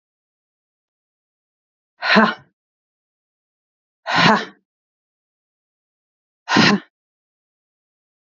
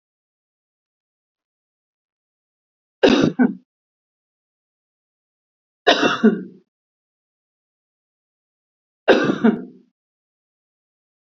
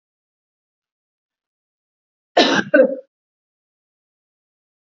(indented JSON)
{
  "exhalation_length": "8.3 s",
  "exhalation_amplitude": 31647,
  "exhalation_signal_mean_std_ratio": 0.26,
  "three_cough_length": "11.3 s",
  "three_cough_amplitude": 32768,
  "three_cough_signal_mean_std_ratio": 0.26,
  "cough_length": "4.9 s",
  "cough_amplitude": 30683,
  "cough_signal_mean_std_ratio": 0.23,
  "survey_phase": "beta (2021-08-13 to 2022-03-07)",
  "age": "45-64",
  "gender": "Female",
  "wearing_mask": "No",
  "symptom_none": true,
  "smoker_status": "Never smoked",
  "respiratory_condition_asthma": false,
  "respiratory_condition_other": false,
  "recruitment_source": "REACT",
  "submission_delay": "2 days",
  "covid_test_result": "Negative",
  "covid_test_method": "RT-qPCR",
  "influenza_a_test_result": "Negative",
  "influenza_b_test_result": "Negative"
}